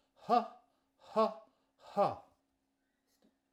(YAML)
exhalation_length: 3.5 s
exhalation_amplitude: 4993
exhalation_signal_mean_std_ratio: 0.31
survey_phase: alpha (2021-03-01 to 2021-08-12)
age: 65+
gender: Male
wearing_mask: 'No'
symptom_none: true
smoker_status: Ex-smoker
respiratory_condition_asthma: false
respiratory_condition_other: false
recruitment_source: REACT
submission_delay: 6 days
covid_test_result: Negative
covid_test_method: RT-qPCR